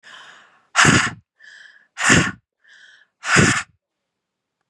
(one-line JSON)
{"exhalation_length": "4.7 s", "exhalation_amplitude": 31660, "exhalation_signal_mean_std_ratio": 0.38, "survey_phase": "beta (2021-08-13 to 2022-03-07)", "age": "45-64", "gender": "Female", "wearing_mask": "No", "symptom_headache": true, "smoker_status": "Ex-smoker", "respiratory_condition_asthma": false, "respiratory_condition_other": false, "recruitment_source": "REACT", "submission_delay": "1 day", "covid_test_result": "Negative", "covid_test_method": "RT-qPCR", "influenza_a_test_result": "Negative", "influenza_b_test_result": "Negative"}